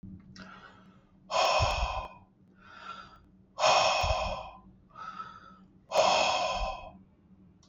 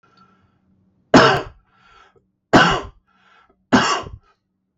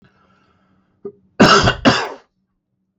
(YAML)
exhalation_length: 7.7 s
exhalation_amplitude: 9341
exhalation_signal_mean_std_ratio: 0.52
three_cough_length: 4.8 s
three_cough_amplitude: 32768
three_cough_signal_mean_std_ratio: 0.33
cough_length: 3.0 s
cough_amplitude: 32767
cough_signal_mean_std_ratio: 0.35
survey_phase: beta (2021-08-13 to 2022-03-07)
age: 18-44
gender: Male
wearing_mask: 'No'
symptom_none: true
smoker_status: Ex-smoker
respiratory_condition_asthma: false
respiratory_condition_other: false
recruitment_source: REACT
submission_delay: 2 days
covid_test_result: Negative
covid_test_method: RT-qPCR
influenza_a_test_result: Unknown/Void
influenza_b_test_result: Unknown/Void